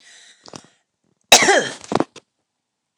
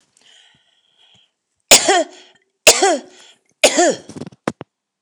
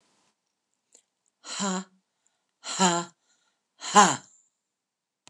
{
  "cough_length": "3.0 s",
  "cough_amplitude": 29204,
  "cough_signal_mean_std_ratio": 0.29,
  "three_cough_length": "5.0 s",
  "three_cough_amplitude": 29204,
  "three_cough_signal_mean_std_ratio": 0.33,
  "exhalation_length": "5.3 s",
  "exhalation_amplitude": 23192,
  "exhalation_signal_mean_std_ratio": 0.27,
  "survey_phase": "beta (2021-08-13 to 2022-03-07)",
  "age": "65+",
  "gender": "Female",
  "wearing_mask": "No",
  "symptom_none": true,
  "smoker_status": "Ex-smoker",
  "respiratory_condition_asthma": false,
  "respiratory_condition_other": false,
  "recruitment_source": "REACT",
  "submission_delay": "4 days",
  "covid_test_result": "Negative",
  "covid_test_method": "RT-qPCR",
  "influenza_a_test_result": "Negative",
  "influenza_b_test_result": "Negative"
}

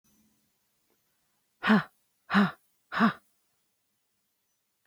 {
  "exhalation_length": "4.9 s",
  "exhalation_amplitude": 12146,
  "exhalation_signal_mean_std_ratio": 0.27,
  "survey_phase": "beta (2021-08-13 to 2022-03-07)",
  "age": "18-44",
  "gender": "Female",
  "wearing_mask": "No",
  "symptom_cough_any": true,
  "symptom_sore_throat": true,
  "symptom_headache": true,
  "symptom_change_to_sense_of_smell_or_taste": true,
  "symptom_loss_of_taste": true,
  "symptom_onset": "2 days",
  "smoker_status": "Ex-smoker",
  "respiratory_condition_asthma": false,
  "respiratory_condition_other": false,
  "recruitment_source": "Test and Trace",
  "submission_delay": "2 days",
  "covid_test_result": "Positive",
  "covid_test_method": "RT-qPCR",
  "covid_ct_value": 33.1,
  "covid_ct_gene": "ORF1ab gene"
}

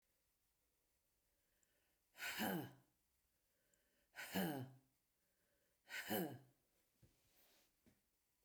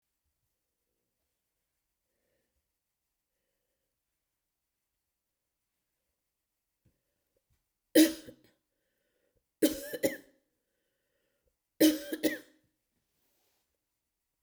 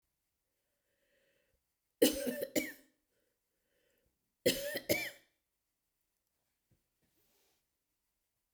{
  "exhalation_length": "8.4 s",
  "exhalation_amplitude": 1258,
  "exhalation_signal_mean_std_ratio": 0.34,
  "three_cough_length": "14.4 s",
  "three_cough_amplitude": 11991,
  "three_cough_signal_mean_std_ratio": 0.17,
  "cough_length": "8.5 s",
  "cough_amplitude": 7243,
  "cough_signal_mean_std_ratio": 0.24,
  "survey_phase": "beta (2021-08-13 to 2022-03-07)",
  "age": "65+",
  "gender": "Female",
  "wearing_mask": "No",
  "symptom_none": true,
  "smoker_status": "Never smoked",
  "respiratory_condition_asthma": false,
  "respiratory_condition_other": false,
  "recruitment_source": "REACT",
  "submission_delay": "6 days",
  "covid_test_result": "Negative",
  "covid_test_method": "RT-qPCR",
  "influenza_a_test_result": "Negative",
  "influenza_b_test_result": "Negative"
}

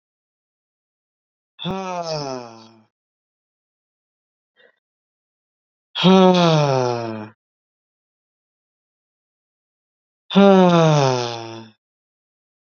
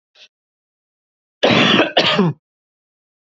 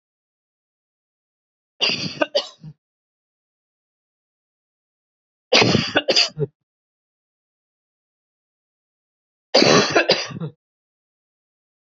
{
  "exhalation_length": "12.8 s",
  "exhalation_amplitude": 27480,
  "exhalation_signal_mean_std_ratio": 0.34,
  "cough_length": "3.2 s",
  "cough_amplitude": 30188,
  "cough_signal_mean_std_ratio": 0.42,
  "three_cough_length": "11.9 s",
  "three_cough_amplitude": 30856,
  "three_cough_signal_mean_std_ratio": 0.29,
  "survey_phase": "beta (2021-08-13 to 2022-03-07)",
  "age": "18-44",
  "gender": "Male",
  "wearing_mask": "No",
  "symptom_cough_any": true,
  "symptom_runny_or_blocked_nose": true,
  "symptom_onset": "12 days",
  "smoker_status": "Ex-smoker",
  "respiratory_condition_asthma": false,
  "respiratory_condition_other": false,
  "recruitment_source": "REACT",
  "submission_delay": "3 days",
  "covid_test_result": "Negative",
  "covid_test_method": "RT-qPCR",
  "influenza_a_test_result": "Negative",
  "influenza_b_test_result": "Negative"
}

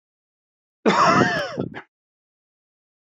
{
  "cough_length": "3.1 s",
  "cough_amplitude": 23759,
  "cough_signal_mean_std_ratio": 0.39,
  "survey_phase": "beta (2021-08-13 to 2022-03-07)",
  "age": "18-44",
  "gender": "Male",
  "wearing_mask": "No",
  "symptom_none": true,
  "symptom_onset": "3 days",
  "smoker_status": "Never smoked",
  "respiratory_condition_asthma": false,
  "respiratory_condition_other": false,
  "recruitment_source": "REACT",
  "submission_delay": "2 days",
  "covid_test_result": "Negative",
  "covid_test_method": "RT-qPCR",
  "influenza_a_test_result": "Negative",
  "influenza_b_test_result": "Negative"
}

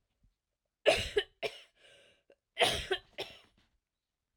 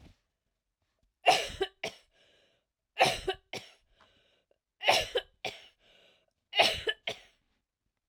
{
  "cough_length": "4.4 s",
  "cough_amplitude": 9180,
  "cough_signal_mean_std_ratio": 0.31,
  "three_cough_length": "8.1 s",
  "three_cough_amplitude": 13750,
  "three_cough_signal_mean_std_ratio": 0.3,
  "survey_phase": "alpha (2021-03-01 to 2021-08-12)",
  "age": "45-64",
  "gender": "Female",
  "wearing_mask": "No",
  "symptom_cough_any": true,
  "symptom_fatigue": true,
  "smoker_status": "Ex-smoker",
  "respiratory_condition_asthma": false,
  "respiratory_condition_other": false,
  "recruitment_source": "Test and Trace",
  "submission_delay": "2 days",
  "covid_test_result": "Positive",
  "covid_test_method": "RT-qPCR"
}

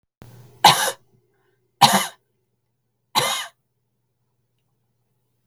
{
  "three_cough_length": "5.5 s",
  "three_cough_amplitude": 32768,
  "three_cough_signal_mean_std_ratio": 0.26,
  "survey_phase": "beta (2021-08-13 to 2022-03-07)",
  "age": "45-64",
  "gender": "Female",
  "wearing_mask": "No",
  "symptom_abdominal_pain": true,
  "smoker_status": "Never smoked",
  "respiratory_condition_asthma": true,
  "respiratory_condition_other": false,
  "recruitment_source": "REACT",
  "submission_delay": "2 days",
  "covid_test_result": "Negative",
  "covid_test_method": "RT-qPCR",
  "influenza_a_test_result": "Negative",
  "influenza_b_test_result": "Negative"
}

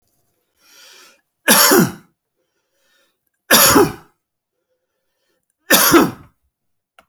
{
  "three_cough_length": "7.1 s",
  "three_cough_amplitude": 32472,
  "three_cough_signal_mean_std_ratio": 0.35,
  "survey_phase": "beta (2021-08-13 to 2022-03-07)",
  "age": "65+",
  "gender": "Male",
  "wearing_mask": "No",
  "symptom_none": true,
  "smoker_status": "Never smoked",
  "respiratory_condition_asthma": false,
  "respiratory_condition_other": false,
  "recruitment_source": "REACT",
  "submission_delay": "1 day",
  "covid_test_result": "Negative",
  "covid_test_method": "RT-qPCR"
}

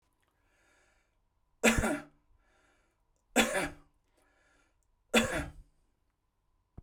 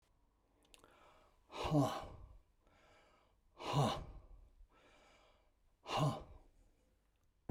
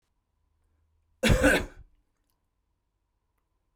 {
  "three_cough_length": "6.8 s",
  "three_cough_amplitude": 10949,
  "three_cough_signal_mean_std_ratio": 0.29,
  "exhalation_length": "7.5 s",
  "exhalation_amplitude": 2601,
  "exhalation_signal_mean_std_ratio": 0.35,
  "cough_length": "3.8 s",
  "cough_amplitude": 12124,
  "cough_signal_mean_std_ratio": 0.27,
  "survey_phase": "beta (2021-08-13 to 2022-03-07)",
  "age": "65+",
  "gender": "Male",
  "wearing_mask": "No",
  "symptom_runny_or_blocked_nose": true,
  "symptom_shortness_of_breath": true,
  "symptom_fatigue": true,
  "smoker_status": "Ex-smoker",
  "respiratory_condition_asthma": false,
  "respiratory_condition_other": false,
  "recruitment_source": "REACT",
  "submission_delay": "9 days",
  "covid_test_result": "Negative",
  "covid_test_method": "RT-qPCR",
  "influenza_a_test_result": "Negative",
  "influenza_b_test_result": "Negative"
}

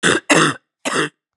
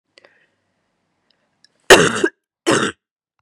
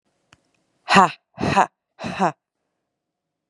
{
  "three_cough_length": "1.4 s",
  "three_cough_amplitude": 32350,
  "three_cough_signal_mean_std_ratio": 0.54,
  "cough_length": "3.4 s",
  "cough_amplitude": 32768,
  "cough_signal_mean_std_ratio": 0.28,
  "exhalation_length": "3.5 s",
  "exhalation_amplitude": 32704,
  "exhalation_signal_mean_std_ratio": 0.29,
  "survey_phase": "beta (2021-08-13 to 2022-03-07)",
  "age": "18-44",
  "gender": "Female",
  "wearing_mask": "No",
  "symptom_new_continuous_cough": true,
  "symptom_runny_or_blocked_nose": true,
  "symptom_shortness_of_breath": true,
  "symptom_sore_throat": true,
  "symptom_fever_high_temperature": true,
  "symptom_onset": "2 days",
  "smoker_status": "Never smoked",
  "respiratory_condition_asthma": false,
  "respiratory_condition_other": false,
  "recruitment_source": "Test and Trace",
  "submission_delay": "1 day",
  "covid_test_result": "Positive",
  "covid_test_method": "RT-qPCR",
  "covid_ct_value": 23.8,
  "covid_ct_gene": "ORF1ab gene",
  "covid_ct_mean": 24.3,
  "covid_viral_load": "10000 copies/ml",
  "covid_viral_load_category": "Low viral load (10K-1M copies/ml)"
}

